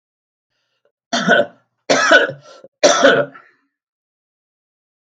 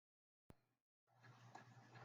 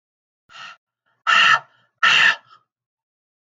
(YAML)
three_cough_length: 5.0 s
three_cough_amplitude: 32768
three_cough_signal_mean_std_ratio: 0.38
cough_length: 2.0 s
cough_amplitude: 173
cough_signal_mean_std_ratio: 0.58
exhalation_length: 3.4 s
exhalation_amplitude: 23112
exhalation_signal_mean_std_ratio: 0.37
survey_phase: beta (2021-08-13 to 2022-03-07)
age: 65+
gender: Male
wearing_mask: 'No'
symptom_cough_any: true
symptom_sore_throat: true
smoker_status: Ex-smoker
respiratory_condition_asthma: false
respiratory_condition_other: false
recruitment_source: Test and Trace
submission_delay: 3 days
covid_test_result: Positive
covid_test_method: ePCR